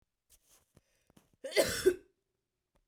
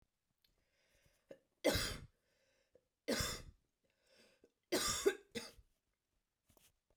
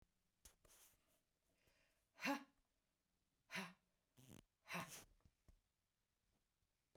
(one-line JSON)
{"cough_length": "2.9 s", "cough_amplitude": 6073, "cough_signal_mean_std_ratio": 0.27, "three_cough_length": "7.0 s", "three_cough_amplitude": 3306, "three_cough_signal_mean_std_ratio": 0.31, "exhalation_length": "7.0 s", "exhalation_amplitude": 844, "exhalation_signal_mean_std_ratio": 0.27, "survey_phase": "beta (2021-08-13 to 2022-03-07)", "age": "45-64", "gender": "Female", "wearing_mask": "No", "symptom_sore_throat": true, "symptom_abdominal_pain": true, "symptom_onset": "4 days", "smoker_status": "Ex-smoker", "respiratory_condition_asthma": false, "respiratory_condition_other": false, "recruitment_source": "REACT", "submission_delay": "1 day", "covid_test_result": "Negative", "covid_test_method": "RT-qPCR", "influenza_a_test_result": "Negative", "influenza_b_test_result": "Negative"}